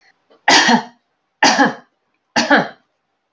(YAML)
three_cough_length: 3.3 s
three_cough_amplitude: 31640
three_cough_signal_mean_std_ratio: 0.43
survey_phase: alpha (2021-03-01 to 2021-08-12)
age: 45-64
gender: Female
wearing_mask: 'No'
symptom_none: true
smoker_status: Current smoker (1 to 10 cigarettes per day)
respiratory_condition_asthma: false
respiratory_condition_other: false
recruitment_source: REACT
submission_delay: 3 days
covid_test_result: Negative
covid_test_method: RT-qPCR